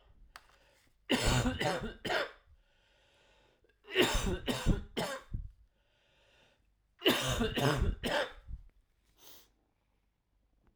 {"three_cough_length": "10.8 s", "three_cough_amplitude": 6647, "three_cough_signal_mean_std_ratio": 0.46, "survey_phase": "alpha (2021-03-01 to 2021-08-12)", "age": "45-64", "gender": "Male", "wearing_mask": "No", "symptom_cough_any": true, "symptom_fever_high_temperature": true, "symptom_change_to_sense_of_smell_or_taste": true, "symptom_loss_of_taste": true, "symptom_onset": "4 days", "smoker_status": "Never smoked", "respiratory_condition_asthma": false, "respiratory_condition_other": false, "recruitment_source": "Test and Trace", "submission_delay": "1 day", "covid_test_result": "Positive", "covid_test_method": "RT-qPCR", "covid_ct_value": 13.0, "covid_ct_gene": "N gene", "covid_ct_mean": 13.6, "covid_viral_load": "35000000 copies/ml", "covid_viral_load_category": "High viral load (>1M copies/ml)"}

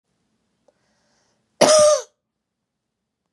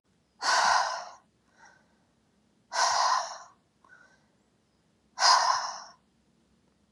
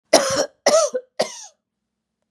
{"cough_length": "3.3 s", "cough_amplitude": 30808, "cough_signal_mean_std_ratio": 0.29, "exhalation_length": "6.9 s", "exhalation_amplitude": 13863, "exhalation_signal_mean_std_ratio": 0.41, "three_cough_length": "2.3 s", "three_cough_amplitude": 32767, "three_cough_signal_mean_std_ratio": 0.43, "survey_phase": "beta (2021-08-13 to 2022-03-07)", "age": "45-64", "gender": "Female", "wearing_mask": "No", "symptom_none": true, "smoker_status": "Ex-smoker", "respiratory_condition_asthma": false, "respiratory_condition_other": false, "recruitment_source": "REACT", "submission_delay": "3 days", "covid_test_result": "Negative", "covid_test_method": "RT-qPCR", "influenza_a_test_result": "Negative", "influenza_b_test_result": "Negative"}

